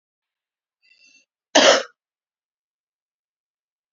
{
  "cough_length": "3.9 s",
  "cough_amplitude": 32768,
  "cough_signal_mean_std_ratio": 0.2,
  "survey_phase": "beta (2021-08-13 to 2022-03-07)",
  "age": "45-64",
  "gender": "Female",
  "wearing_mask": "No",
  "symptom_cough_any": true,
  "symptom_shortness_of_breath": true,
  "symptom_headache": true,
  "symptom_change_to_sense_of_smell_or_taste": true,
  "symptom_loss_of_taste": true,
  "smoker_status": "Ex-smoker",
  "respiratory_condition_asthma": false,
  "respiratory_condition_other": false,
  "recruitment_source": "Test and Trace",
  "submission_delay": "2 days",
  "covid_test_result": "Positive",
  "covid_test_method": "RT-qPCR",
  "covid_ct_value": 11.5,
  "covid_ct_gene": "N gene",
  "covid_ct_mean": 11.6,
  "covid_viral_load": "150000000 copies/ml",
  "covid_viral_load_category": "High viral load (>1M copies/ml)"
}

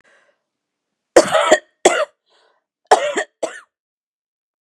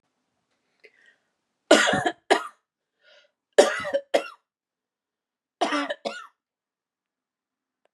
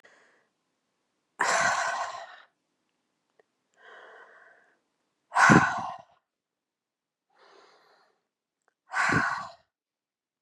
{
  "cough_length": "4.6 s",
  "cough_amplitude": 32768,
  "cough_signal_mean_std_ratio": 0.31,
  "three_cough_length": "7.9 s",
  "three_cough_amplitude": 32343,
  "three_cough_signal_mean_std_ratio": 0.27,
  "exhalation_length": "10.4 s",
  "exhalation_amplitude": 23887,
  "exhalation_signal_mean_std_ratio": 0.3,
  "survey_phase": "beta (2021-08-13 to 2022-03-07)",
  "age": "45-64",
  "gender": "Female",
  "wearing_mask": "No",
  "symptom_none": true,
  "smoker_status": "Never smoked",
  "respiratory_condition_asthma": false,
  "respiratory_condition_other": false,
  "recruitment_source": "REACT",
  "submission_delay": "1 day",
  "covid_test_result": "Negative",
  "covid_test_method": "RT-qPCR",
  "influenza_a_test_result": "Negative",
  "influenza_b_test_result": "Negative"
}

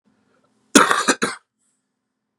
{
  "cough_length": "2.4 s",
  "cough_amplitude": 32768,
  "cough_signal_mean_std_ratio": 0.3,
  "survey_phase": "beta (2021-08-13 to 2022-03-07)",
  "age": "18-44",
  "gender": "Male",
  "wearing_mask": "No",
  "symptom_cough_any": true,
  "symptom_runny_or_blocked_nose": true,
  "symptom_sore_throat": true,
  "symptom_fatigue": true,
  "symptom_change_to_sense_of_smell_or_taste": true,
  "symptom_onset": "4 days",
  "smoker_status": "Never smoked",
  "respiratory_condition_asthma": false,
  "respiratory_condition_other": false,
  "recruitment_source": "Test and Trace",
  "submission_delay": "2 days",
  "covid_test_result": "Positive",
  "covid_test_method": "RT-qPCR",
  "covid_ct_value": 17.2,
  "covid_ct_gene": "N gene"
}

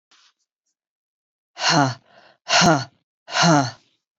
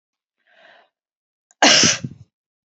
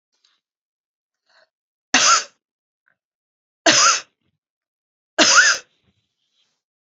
{
  "exhalation_length": "4.2 s",
  "exhalation_amplitude": 22323,
  "exhalation_signal_mean_std_ratio": 0.4,
  "cough_length": "2.6 s",
  "cough_amplitude": 31972,
  "cough_signal_mean_std_ratio": 0.3,
  "three_cough_length": "6.8 s",
  "three_cough_amplitude": 31040,
  "three_cough_signal_mean_std_ratio": 0.31,
  "survey_phase": "beta (2021-08-13 to 2022-03-07)",
  "age": "65+",
  "gender": "Female",
  "wearing_mask": "No",
  "symptom_none": true,
  "smoker_status": "Never smoked",
  "respiratory_condition_asthma": false,
  "respiratory_condition_other": false,
  "recruitment_source": "REACT",
  "submission_delay": "1 day",
  "covid_test_result": "Negative",
  "covid_test_method": "RT-qPCR",
  "influenza_a_test_result": "Negative",
  "influenza_b_test_result": "Negative"
}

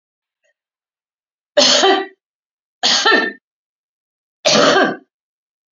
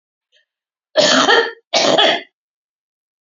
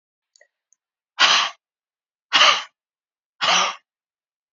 {
  "three_cough_length": "5.7 s",
  "three_cough_amplitude": 32767,
  "three_cough_signal_mean_std_ratio": 0.41,
  "cough_length": "3.2 s",
  "cough_amplitude": 32346,
  "cough_signal_mean_std_ratio": 0.46,
  "exhalation_length": "4.5 s",
  "exhalation_amplitude": 32486,
  "exhalation_signal_mean_std_ratio": 0.34,
  "survey_phase": "alpha (2021-03-01 to 2021-08-12)",
  "age": "45-64",
  "gender": "Female",
  "wearing_mask": "No",
  "symptom_none": true,
  "smoker_status": "Ex-smoker",
  "respiratory_condition_asthma": false,
  "respiratory_condition_other": false,
  "recruitment_source": "REACT",
  "submission_delay": "31 days",
  "covid_test_result": "Negative",
  "covid_test_method": "RT-qPCR"
}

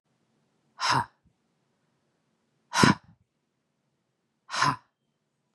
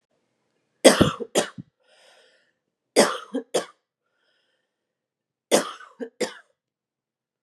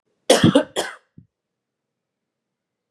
{
  "exhalation_length": "5.5 s",
  "exhalation_amplitude": 25247,
  "exhalation_signal_mean_std_ratio": 0.25,
  "three_cough_length": "7.4 s",
  "three_cough_amplitude": 32709,
  "three_cough_signal_mean_std_ratio": 0.25,
  "cough_length": "2.9 s",
  "cough_amplitude": 30218,
  "cough_signal_mean_std_ratio": 0.27,
  "survey_phase": "beta (2021-08-13 to 2022-03-07)",
  "age": "18-44",
  "gender": "Female",
  "wearing_mask": "No",
  "symptom_runny_or_blocked_nose": true,
  "symptom_abdominal_pain": true,
  "symptom_fatigue": true,
  "symptom_onset": "6 days",
  "smoker_status": "Current smoker (1 to 10 cigarettes per day)",
  "respiratory_condition_asthma": true,
  "respiratory_condition_other": false,
  "recruitment_source": "Test and Trace",
  "submission_delay": "2 days",
  "covid_test_result": "Positive",
  "covid_test_method": "RT-qPCR",
  "covid_ct_value": 22.3,
  "covid_ct_gene": "ORF1ab gene",
  "covid_ct_mean": 22.4,
  "covid_viral_load": "45000 copies/ml",
  "covid_viral_load_category": "Low viral load (10K-1M copies/ml)"
}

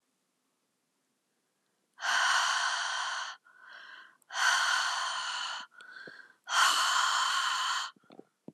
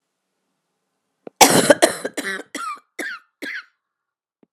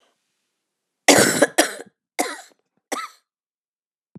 {
  "exhalation_length": "8.5 s",
  "exhalation_amplitude": 7292,
  "exhalation_signal_mean_std_ratio": 0.61,
  "cough_length": "4.5 s",
  "cough_amplitude": 32768,
  "cough_signal_mean_std_ratio": 0.3,
  "three_cough_length": "4.2 s",
  "three_cough_amplitude": 32767,
  "three_cough_signal_mean_std_ratio": 0.29,
  "survey_phase": "alpha (2021-03-01 to 2021-08-12)",
  "age": "45-64",
  "gender": "Female",
  "wearing_mask": "No",
  "symptom_cough_any": true,
  "symptom_shortness_of_breath": true,
  "symptom_fatigue": true,
  "symptom_fever_high_temperature": true,
  "symptom_headache": true,
  "symptom_onset": "5 days",
  "smoker_status": "Never smoked",
  "respiratory_condition_asthma": false,
  "respiratory_condition_other": false,
  "recruitment_source": "Test and Trace",
  "submission_delay": "2 days",
  "covid_ct_value": 25.2,
  "covid_ct_gene": "ORF1ab gene"
}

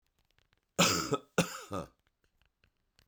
{
  "cough_length": "3.1 s",
  "cough_amplitude": 9791,
  "cough_signal_mean_std_ratio": 0.33,
  "survey_phase": "beta (2021-08-13 to 2022-03-07)",
  "age": "45-64",
  "gender": "Male",
  "wearing_mask": "No",
  "symptom_cough_any": true,
  "symptom_runny_or_blocked_nose": true,
  "symptom_sore_throat": true,
  "symptom_fatigue": true,
  "symptom_headache": true,
  "symptom_onset": "5 days",
  "smoker_status": "Ex-smoker",
  "respiratory_condition_asthma": false,
  "respiratory_condition_other": false,
  "recruitment_source": "Test and Trace",
  "submission_delay": "2 days",
  "covid_test_result": "Positive",
  "covid_test_method": "RT-qPCR",
  "covid_ct_value": 14.7,
  "covid_ct_gene": "N gene"
}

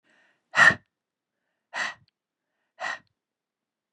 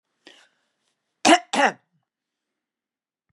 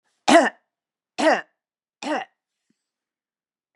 {
  "exhalation_length": "3.9 s",
  "exhalation_amplitude": 22599,
  "exhalation_signal_mean_std_ratio": 0.22,
  "cough_length": "3.3 s",
  "cough_amplitude": 30352,
  "cough_signal_mean_std_ratio": 0.23,
  "three_cough_length": "3.8 s",
  "three_cough_amplitude": 28960,
  "three_cough_signal_mean_std_ratio": 0.28,
  "survey_phase": "beta (2021-08-13 to 2022-03-07)",
  "age": "65+",
  "gender": "Female",
  "wearing_mask": "No",
  "symptom_cough_any": true,
  "smoker_status": "Never smoked",
  "respiratory_condition_asthma": false,
  "respiratory_condition_other": false,
  "recruitment_source": "REACT",
  "submission_delay": "2 days",
  "covid_test_result": "Negative",
  "covid_test_method": "RT-qPCR",
  "influenza_a_test_result": "Negative",
  "influenza_b_test_result": "Negative"
}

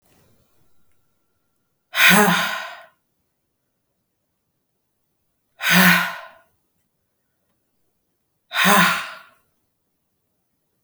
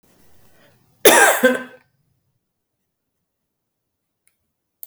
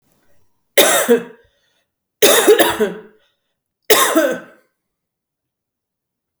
{
  "exhalation_length": "10.8 s",
  "exhalation_amplitude": 32768,
  "exhalation_signal_mean_std_ratio": 0.31,
  "cough_length": "4.9 s",
  "cough_amplitude": 32768,
  "cough_signal_mean_std_ratio": 0.25,
  "three_cough_length": "6.4 s",
  "three_cough_amplitude": 32768,
  "three_cough_signal_mean_std_ratio": 0.39,
  "survey_phase": "beta (2021-08-13 to 2022-03-07)",
  "age": "18-44",
  "gender": "Female",
  "wearing_mask": "No",
  "symptom_cough_any": true,
  "symptom_runny_or_blocked_nose": true,
  "symptom_sore_throat": true,
  "symptom_change_to_sense_of_smell_or_taste": true,
  "symptom_onset": "4 days",
  "smoker_status": "Ex-smoker",
  "respiratory_condition_asthma": false,
  "respiratory_condition_other": false,
  "recruitment_source": "Test and Trace",
  "submission_delay": "1 day",
  "covid_test_result": "Positive",
  "covid_test_method": "RT-qPCR"
}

